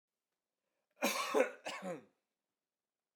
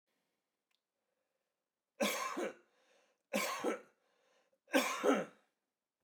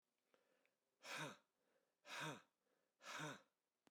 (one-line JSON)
{"cough_length": "3.2 s", "cough_amplitude": 5464, "cough_signal_mean_std_ratio": 0.35, "three_cough_length": "6.0 s", "three_cough_amplitude": 4878, "three_cough_signal_mean_std_ratio": 0.37, "exhalation_length": "3.9 s", "exhalation_amplitude": 399, "exhalation_signal_mean_std_ratio": 0.43, "survey_phase": "beta (2021-08-13 to 2022-03-07)", "age": "45-64", "gender": "Male", "wearing_mask": "No", "symptom_none": true, "smoker_status": "Ex-smoker", "respiratory_condition_asthma": false, "respiratory_condition_other": false, "recruitment_source": "REACT", "submission_delay": "1 day", "covid_test_result": "Negative", "covid_test_method": "RT-qPCR"}